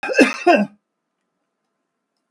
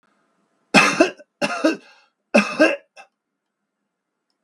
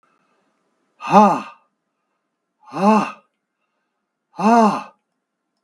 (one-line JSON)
{"cough_length": "2.3 s", "cough_amplitude": 32768, "cough_signal_mean_std_ratio": 0.34, "three_cough_length": "4.4 s", "three_cough_amplitude": 32768, "three_cough_signal_mean_std_ratio": 0.34, "exhalation_length": "5.6 s", "exhalation_amplitude": 32768, "exhalation_signal_mean_std_ratio": 0.33, "survey_phase": "beta (2021-08-13 to 2022-03-07)", "age": "65+", "gender": "Male", "wearing_mask": "No", "symptom_runny_or_blocked_nose": true, "symptom_sore_throat": true, "smoker_status": "Ex-smoker", "respiratory_condition_asthma": true, "respiratory_condition_other": true, "recruitment_source": "REACT", "submission_delay": "2 days", "covid_test_result": "Negative", "covid_test_method": "RT-qPCR", "influenza_a_test_result": "Negative", "influenza_b_test_result": "Negative"}